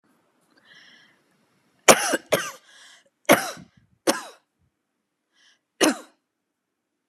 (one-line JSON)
{"three_cough_length": "7.1 s", "three_cough_amplitude": 32768, "three_cough_signal_mean_std_ratio": 0.23, "survey_phase": "beta (2021-08-13 to 2022-03-07)", "age": "45-64", "gender": "Female", "wearing_mask": "No", "symptom_none": true, "smoker_status": "Never smoked", "respiratory_condition_asthma": false, "respiratory_condition_other": false, "recruitment_source": "REACT", "submission_delay": "1 day", "covid_test_result": "Negative", "covid_test_method": "RT-qPCR", "influenza_a_test_result": "Negative", "influenza_b_test_result": "Negative"}